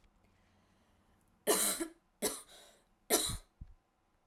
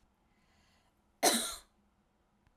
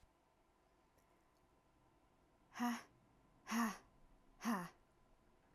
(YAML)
three_cough_length: 4.3 s
three_cough_amplitude: 5659
three_cough_signal_mean_std_ratio: 0.35
cough_length: 2.6 s
cough_amplitude: 7811
cough_signal_mean_std_ratio: 0.26
exhalation_length: 5.5 s
exhalation_amplitude: 1233
exhalation_signal_mean_std_ratio: 0.34
survey_phase: alpha (2021-03-01 to 2021-08-12)
age: 18-44
gender: Female
wearing_mask: 'No'
symptom_headache: true
symptom_onset: 12 days
smoker_status: Ex-smoker
respiratory_condition_asthma: false
respiratory_condition_other: false
recruitment_source: REACT
submission_delay: 2 days
covid_test_result: Negative
covid_test_method: RT-qPCR